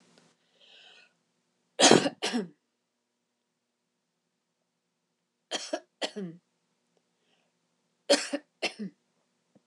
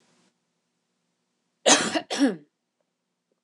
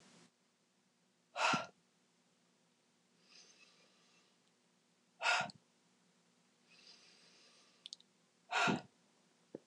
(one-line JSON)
{"three_cough_length": "9.7 s", "three_cough_amplitude": 23958, "three_cough_signal_mean_std_ratio": 0.22, "cough_length": "3.4 s", "cough_amplitude": 22626, "cough_signal_mean_std_ratio": 0.29, "exhalation_length": "9.7 s", "exhalation_amplitude": 2978, "exhalation_signal_mean_std_ratio": 0.27, "survey_phase": "beta (2021-08-13 to 2022-03-07)", "age": "45-64", "gender": "Female", "wearing_mask": "No", "symptom_none": true, "smoker_status": "Never smoked", "respiratory_condition_asthma": false, "respiratory_condition_other": false, "recruitment_source": "REACT", "submission_delay": "6 days", "covid_test_result": "Negative", "covid_test_method": "RT-qPCR", "influenza_a_test_result": "Negative", "influenza_b_test_result": "Negative"}